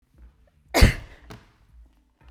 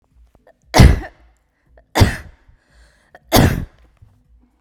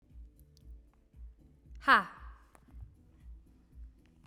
{
  "cough_length": "2.3 s",
  "cough_amplitude": 29355,
  "cough_signal_mean_std_ratio": 0.23,
  "three_cough_length": "4.6 s",
  "three_cough_amplitude": 32768,
  "three_cough_signal_mean_std_ratio": 0.3,
  "exhalation_length": "4.3 s",
  "exhalation_amplitude": 9286,
  "exhalation_signal_mean_std_ratio": 0.24,
  "survey_phase": "beta (2021-08-13 to 2022-03-07)",
  "age": "18-44",
  "gender": "Female",
  "wearing_mask": "No",
  "symptom_runny_or_blocked_nose": true,
  "symptom_onset": "13 days",
  "smoker_status": "Ex-smoker",
  "respiratory_condition_asthma": false,
  "respiratory_condition_other": false,
  "recruitment_source": "REACT",
  "submission_delay": "3 days",
  "covid_test_result": "Negative",
  "covid_test_method": "RT-qPCR",
  "influenza_a_test_result": "Negative",
  "influenza_b_test_result": "Negative"
}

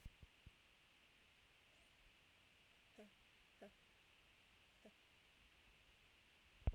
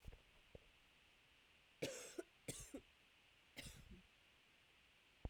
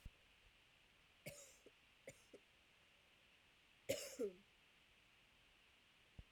{
  "exhalation_length": "6.7 s",
  "exhalation_amplitude": 1216,
  "exhalation_signal_mean_std_ratio": 0.25,
  "cough_length": "5.3 s",
  "cough_amplitude": 906,
  "cough_signal_mean_std_ratio": 0.45,
  "three_cough_length": "6.3 s",
  "three_cough_amplitude": 1141,
  "three_cough_signal_mean_std_ratio": 0.35,
  "survey_phase": "beta (2021-08-13 to 2022-03-07)",
  "age": "18-44",
  "gender": "Female",
  "wearing_mask": "No",
  "symptom_runny_or_blocked_nose": true,
  "symptom_abdominal_pain": true,
  "symptom_fatigue": true,
  "symptom_fever_high_temperature": true,
  "smoker_status": "Never smoked",
  "respiratory_condition_asthma": false,
  "respiratory_condition_other": false,
  "recruitment_source": "Test and Trace",
  "submission_delay": "2 days",
  "covid_test_result": "Positive",
  "covid_test_method": "RT-qPCR",
  "covid_ct_value": 20.3,
  "covid_ct_gene": "ORF1ab gene"
}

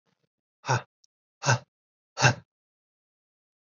{
  "exhalation_length": "3.7 s",
  "exhalation_amplitude": 17547,
  "exhalation_signal_mean_std_ratio": 0.25,
  "survey_phase": "alpha (2021-03-01 to 2021-08-12)",
  "age": "45-64",
  "gender": "Male",
  "wearing_mask": "No",
  "symptom_cough_any": true,
  "symptom_fatigue": true,
  "symptom_headache": true,
  "smoker_status": "Never smoked",
  "respiratory_condition_asthma": false,
  "respiratory_condition_other": false,
  "recruitment_source": "Test and Trace",
  "submission_delay": "2 days",
  "covid_test_result": "Positive",
  "covid_test_method": "RT-qPCR",
  "covid_ct_value": 22.4,
  "covid_ct_gene": "ORF1ab gene",
  "covid_ct_mean": 23.1,
  "covid_viral_load": "27000 copies/ml",
  "covid_viral_load_category": "Low viral load (10K-1M copies/ml)"
}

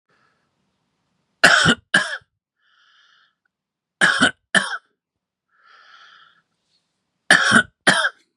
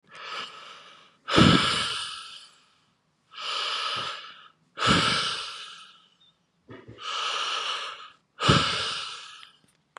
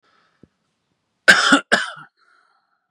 {
  "three_cough_length": "8.4 s",
  "three_cough_amplitude": 32768,
  "three_cough_signal_mean_std_ratio": 0.32,
  "exhalation_length": "10.0 s",
  "exhalation_amplitude": 21079,
  "exhalation_signal_mean_std_ratio": 0.5,
  "cough_length": "2.9 s",
  "cough_amplitude": 32768,
  "cough_signal_mean_std_ratio": 0.29,
  "survey_phase": "beta (2021-08-13 to 2022-03-07)",
  "age": "18-44",
  "gender": "Male",
  "wearing_mask": "No",
  "symptom_cough_any": true,
  "symptom_other": true,
  "symptom_onset": "4 days",
  "smoker_status": "Never smoked",
  "respiratory_condition_asthma": false,
  "respiratory_condition_other": false,
  "recruitment_source": "Test and Trace",
  "submission_delay": "2 days",
  "covid_test_result": "Positive",
  "covid_test_method": "RT-qPCR",
  "covid_ct_value": 16.3,
  "covid_ct_gene": "N gene"
}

